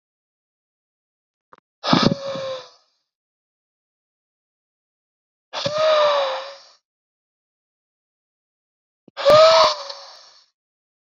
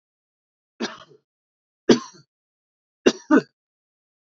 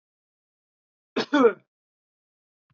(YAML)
exhalation_length: 11.2 s
exhalation_amplitude: 27543
exhalation_signal_mean_std_ratio: 0.32
three_cough_length: 4.3 s
three_cough_amplitude: 27580
three_cough_signal_mean_std_ratio: 0.21
cough_length: 2.7 s
cough_amplitude: 15970
cough_signal_mean_std_ratio: 0.23
survey_phase: beta (2021-08-13 to 2022-03-07)
age: 18-44
gender: Male
wearing_mask: 'No'
symptom_none: true
smoker_status: Current smoker (e-cigarettes or vapes only)
respiratory_condition_asthma: false
respiratory_condition_other: false
recruitment_source: REACT
submission_delay: 4 days
covid_test_result: Negative
covid_test_method: RT-qPCR
influenza_a_test_result: Negative
influenza_b_test_result: Negative